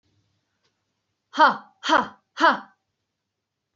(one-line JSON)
{"exhalation_length": "3.8 s", "exhalation_amplitude": 20529, "exhalation_signal_mean_std_ratio": 0.29, "survey_phase": "beta (2021-08-13 to 2022-03-07)", "age": "18-44", "gender": "Female", "wearing_mask": "No", "symptom_none": true, "symptom_onset": "12 days", "smoker_status": "Never smoked", "respiratory_condition_asthma": false, "respiratory_condition_other": false, "recruitment_source": "REACT", "submission_delay": "2 days", "covid_test_result": "Negative", "covid_test_method": "RT-qPCR", "influenza_a_test_result": "Negative", "influenza_b_test_result": "Negative"}